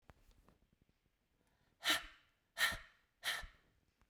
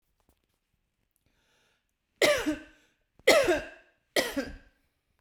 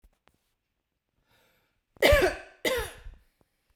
{
  "exhalation_length": "4.1 s",
  "exhalation_amplitude": 2626,
  "exhalation_signal_mean_std_ratio": 0.3,
  "three_cough_length": "5.2 s",
  "three_cough_amplitude": 15772,
  "three_cough_signal_mean_std_ratio": 0.32,
  "cough_length": "3.8 s",
  "cough_amplitude": 15614,
  "cough_signal_mean_std_ratio": 0.3,
  "survey_phase": "beta (2021-08-13 to 2022-03-07)",
  "age": "18-44",
  "gender": "Female",
  "wearing_mask": "No",
  "symptom_abdominal_pain": true,
  "smoker_status": "Prefer not to say",
  "respiratory_condition_asthma": true,
  "respiratory_condition_other": false,
  "recruitment_source": "REACT",
  "submission_delay": "4 days",
  "covid_test_result": "Negative",
  "covid_test_method": "RT-qPCR"
}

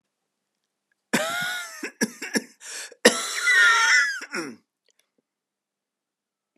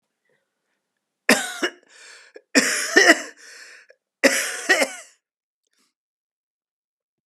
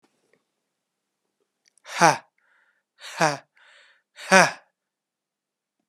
{
  "cough_length": "6.6 s",
  "cough_amplitude": 28238,
  "cough_signal_mean_std_ratio": 0.42,
  "three_cough_length": "7.3 s",
  "three_cough_amplitude": 32767,
  "three_cough_signal_mean_std_ratio": 0.32,
  "exhalation_length": "5.9 s",
  "exhalation_amplitude": 32454,
  "exhalation_signal_mean_std_ratio": 0.22,
  "survey_phase": "alpha (2021-03-01 to 2021-08-12)",
  "age": "45-64",
  "gender": "Male",
  "wearing_mask": "No",
  "symptom_cough_any": true,
  "symptom_shortness_of_breath": true,
  "symptom_fatigue": true,
  "symptom_headache": true,
  "symptom_change_to_sense_of_smell_or_taste": true,
  "smoker_status": "Never smoked",
  "respiratory_condition_asthma": false,
  "respiratory_condition_other": false,
  "recruitment_source": "Test and Trace",
  "submission_delay": "2 days",
  "covid_test_result": "Positive",
  "covid_test_method": "RT-qPCR",
  "covid_ct_value": 19.1,
  "covid_ct_gene": "ORF1ab gene"
}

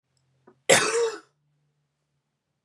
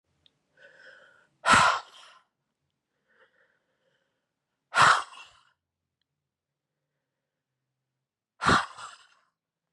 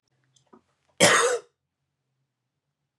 {
  "cough_length": "2.6 s",
  "cough_amplitude": 23211,
  "cough_signal_mean_std_ratio": 0.31,
  "exhalation_length": "9.7 s",
  "exhalation_amplitude": 15978,
  "exhalation_signal_mean_std_ratio": 0.23,
  "three_cough_length": "3.0 s",
  "three_cough_amplitude": 23419,
  "three_cough_signal_mean_std_ratio": 0.28,
  "survey_phase": "beta (2021-08-13 to 2022-03-07)",
  "age": "18-44",
  "gender": "Male",
  "wearing_mask": "No",
  "symptom_runny_or_blocked_nose": true,
  "symptom_sore_throat": true,
  "symptom_other": true,
  "smoker_status": "Never smoked",
  "respiratory_condition_asthma": false,
  "respiratory_condition_other": false,
  "recruitment_source": "Test and Trace",
  "submission_delay": "2 days",
  "covid_test_result": "Positive",
  "covid_test_method": "RT-qPCR",
  "covid_ct_value": 28.6,
  "covid_ct_gene": "ORF1ab gene"
}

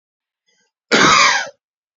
{
  "cough_length": "2.0 s",
  "cough_amplitude": 31967,
  "cough_signal_mean_std_ratio": 0.44,
  "survey_phase": "beta (2021-08-13 to 2022-03-07)",
  "age": "18-44",
  "gender": "Male",
  "wearing_mask": "No",
  "symptom_none": true,
  "symptom_onset": "12 days",
  "smoker_status": "Ex-smoker",
  "respiratory_condition_asthma": false,
  "respiratory_condition_other": false,
  "recruitment_source": "REACT",
  "submission_delay": "1 day",
  "covid_test_result": "Negative",
  "covid_test_method": "RT-qPCR",
  "influenza_a_test_result": "Negative",
  "influenza_b_test_result": "Negative"
}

